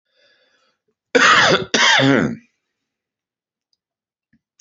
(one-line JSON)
{"cough_length": "4.6 s", "cough_amplitude": 29956, "cough_signal_mean_std_ratio": 0.39, "survey_phase": "alpha (2021-03-01 to 2021-08-12)", "age": "65+", "gender": "Male", "wearing_mask": "No", "symptom_cough_any": true, "symptom_onset": "3 days", "smoker_status": "Ex-smoker", "respiratory_condition_asthma": false, "respiratory_condition_other": false, "recruitment_source": "Test and Trace", "submission_delay": "2 days", "covid_test_result": "Positive", "covid_test_method": "RT-qPCR"}